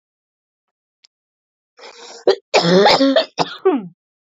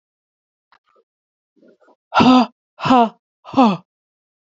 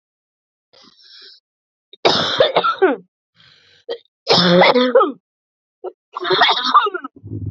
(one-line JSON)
{"cough_length": "4.4 s", "cough_amplitude": 30890, "cough_signal_mean_std_ratio": 0.41, "exhalation_length": "4.5 s", "exhalation_amplitude": 28994, "exhalation_signal_mean_std_ratio": 0.34, "three_cough_length": "7.5 s", "three_cough_amplitude": 29430, "three_cough_signal_mean_std_ratio": 0.47, "survey_phase": "beta (2021-08-13 to 2022-03-07)", "age": "18-44", "gender": "Female", "wearing_mask": "No", "symptom_cough_any": true, "symptom_new_continuous_cough": true, "symptom_runny_or_blocked_nose": true, "symptom_shortness_of_breath": true, "symptom_sore_throat": true, "symptom_fatigue": true, "symptom_fever_high_temperature": true, "symptom_headache": true, "symptom_onset": "4 days", "smoker_status": "Never smoked", "respiratory_condition_asthma": false, "respiratory_condition_other": false, "recruitment_source": "Test and Trace", "submission_delay": "1 day", "covid_test_result": "Positive", "covid_test_method": "RT-qPCR", "covid_ct_value": 23.2, "covid_ct_gene": "ORF1ab gene", "covid_ct_mean": 23.7, "covid_viral_load": "17000 copies/ml", "covid_viral_load_category": "Low viral load (10K-1M copies/ml)"}